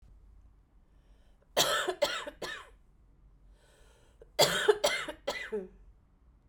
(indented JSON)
{
  "cough_length": "6.5 s",
  "cough_amplitude": 12121,
  "cough_signal_mean_std_ratio": 0.39,
  "survey_phase": "beta (2021-08-13 to 2022-03-07)",
  "age": "45-64",
  "gender": "Female",
  "wearing_mask": "No",
  "symptom_cough_any": true,
  "symptom_onset": "10 days",
  "smoker_status": "Never smoked",
  "respiratory_condition_asthma": false,
  "respiratory_condition_other": false,
  "recruitment_source": "REACT",
  "submission_delay": "1 day",
  "covid_test_result": "Negative",
  "covid_test_method": "RT-qPCR",
  "influenza_a_test_result": "Unknown/Void",
  "influenza_b_test_result": "Unknown/Void"
}